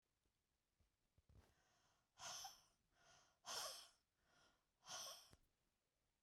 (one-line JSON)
{"exhalation_length": "6.2 s", "exhalation_amplitude": 462, "exhalation_signal_mean_std_ratio": 0.39, "survey_phase": "beta (2021-08-13 to 2022-03-07)", "age": "45-64", "gender": "Female", "wearing_mask": "No", "symptom_cough_any": true, "symptom_onset": "12 days", "smoker_status": "Never smoked", "respiratory_condition_asthma": false, "respiratory_condition_other": false, "recruitment_source": "REACT", "submission_delay": "1 day", "covid_test_result": "Negative", "covid_test_method": "RT-qPCR"}